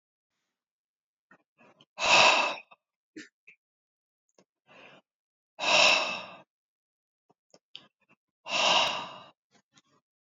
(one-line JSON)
{"exhalation_length": "10.3 s", "exhalation_amplitude": 14532, "exhalation_signal_mean_std_ratio": 0.31, "survey_phase": "beta (2021-08-13 to 2022-03-07)", "age": "65+", "gender": "Male", "wearing_mask": "No", "symptom_none": true, "smoker_status": "Never smoked", "respiratory_condition_asthma": false, "respiratory_condition_other": false, "recruitment_source": "REACT", "submission_delay": "1 day", "covid_test_result": "Negative", "covid_test_method": "RT-qPCR", "influenza_a_test_result": "Negative", "influenza_b_test_result": "Negative"}